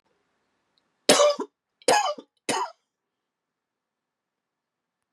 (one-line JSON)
{"three_cough_length": "5.1 s", "three_cough_amplitude": 22366, "three_cough_signal_mean_std_ratio": 0.29, "survey_phase": "beta (2021-08-13 to 2022-03-07)", "age": "45-64", "gender": "Male", "wearing_mask": "No", "symptom_cough_any": true, "symptom_runny_or_blocked_nose": true, "symptom_shortness_of_breath": true, "symptom_change_to_sense_of_smell_or_taste": true, "symptom_onset": "5 days", "smoker_status": "Never smoked", "respiratory_condition_asthma": false, "respiratory_condition_other": false, "recruitment_source": "Test and Trace", "submission_delay": "3 days", "covid_test_result": "Positive", "covid_test_method": "RT-qPCR", "covid_ct_value": 15.1, "covid_ct_gene": "ORF1ab gene", "covid_ct_mean": 15.2, "covid_viral_load": "11000000 copies/ml", "covid_viral_load_category": "High viral load (>1M copies/ml)"}